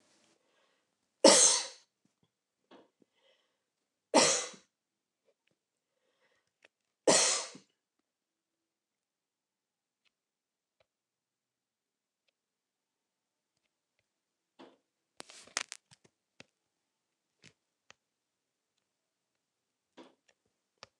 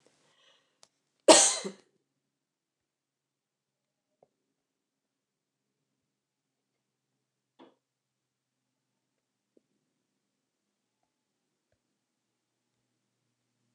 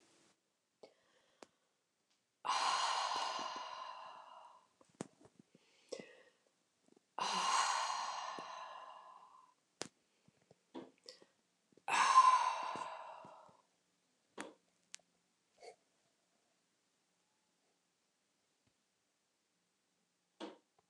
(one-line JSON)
{"three_cough_length": "21.0 s", "three_cough_amplitude": 20170, "three_cough_signal_mean_std_ratio": 0.17, "cough_length": "13.7 s", "cough_amplitude": 23091, "cough_signal_mean_std_ratio": 0.11, "exhalation_length": "20.9 s", "exhalation_amplitude": 5152, "exhalation_signal_mean_std_ratio": 0.32, "survey_phase": "alpha (2021-03-01 to 2021-08-12)", "age": "45-64", "gender": "Female", "wearing_mask": "No", "symptom_none": true, "smoker_status": "Never smoked", "respiratory_condition_asthma": false, "respiratory_condition_other": false, "recruitment_source": "REACT", "submission_delay": "1 day", "covid_test_result": "Negative", "covid_test_method": "RT-qPCR"}